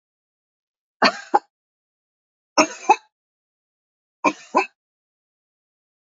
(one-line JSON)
{"three_cough_length": "6.1 s", "three_cough_amplitude": 27735, "three_cough_signal_mean_std_ratio": 0.21, "survey_phase": "beta (2021-08-13 to 2022-03-07)", "age": "45-64", "gender": "Female", "wearing_mask": "No", "symptom_none": true, "symptom_onset": "12 days", "smoker_status": "Never smoked", "respiratory_condition_asthma": false, "respiratory_condition_other": false, "recruitment_source": "REACT", "submission_delay": "1 day", "covid_test_result": "Negative", "covid_test_method": "RT-qPCR"}